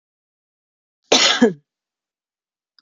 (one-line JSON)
{"cough_length": "2.8 s", "cough_amplitude": 29314, "cough_signal_mean_std_ratio": 0.28, "survey_phase": "beta (2021-08-13 to 2022-03-07)", "age": "45-64", "gender": "Female", "wearing_mask": "No", "symptom_none": true, "smoker_status": "Never smoked", "respiratory_condition_asthma": false, "respiratory_condition_other": false, "recruitment_source": "REACT", "submission_delay": "1 day", "covid_test_result": "Negative", "covid_test_method": "RT-qPCR", "influenza_a_test_result": "Negative", "influenza_b_test_result": "Negative"}